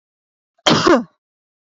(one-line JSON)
{"cough_length": "1.7 s", "cough_amplitude": 29176, "cough_signal_mean_std_ratio": 0.35, "survey_phase": "beta (2021-08-13 to 2022-03-07)", "age": "18-44", "gender": "Female", "wearing_mask": "No", "symptom_none": true, "smoker_status": "Never smoked", "respiratory_condition_asthma": false, "respiratory_condition_other": false, "recruitment_source": "REACT", "submission_delay": "1 day", "covid_test_result": "Negative", "covid_test_method": "RT-qPCR"}